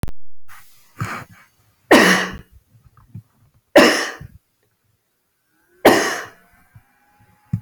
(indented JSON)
{
  "three_cough_length": "7.6 s",
  "three_cough_amplitude": 30570,
  "three_cough_signal_mean_std_ratio": 0.36,
  "survey_phase": "beta (2021-08-13 to 2022-03-07)",
  "age": "45-64",
  "gender": "Female",
  "wearing_mask": "No",
  "symptom_runny_or_blocked_nose": true,
  "smoker_status": "Never smoked",
  "respiratory_condition_asthma": false,
  "respiratory_condition_other": false,
  "recruitment_source": "REACT",
  "submission_delay": "1 day",
  "covid_test_result": "Negative",
  "covid_test_method": "RT-qPCR"
}